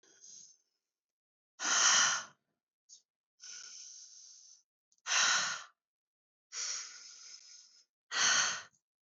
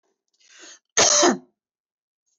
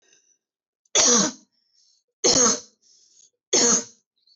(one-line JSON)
{"exhalation_length": "9.0 s", "exhalation_amplitude": 7194, "exhalation_signal_mean_std_ratio": 0.39, "cough_length": "2.4 s", "cough_amplitude": 19691, "cough_signal_mean_std_ratio": 0.34, "three_cough_length": "4.4 s", "three_cough_amplitude": 21383, "three_cough_signal_mean_std_ratio": 0.4, "survey_phase": "beta (2021-08-13 to 2022-03-07)", "age": "18-44", "gender": "Female", "wearing_mask": "No", "symptom_none": true, "smoker_status": "Current smoker (e-cigarettes or vapes only)", "respiratory_condition_asthma": false, "respiratory_condition_other": false, "recruitment_source": "REACT", "submission_delay": "2 days", "covid_test_result": "Negative", "covid_test_method": "RT-qPCR", "influenza_a_test_result": "Negative", "influenza_b_test_result": "Negative"}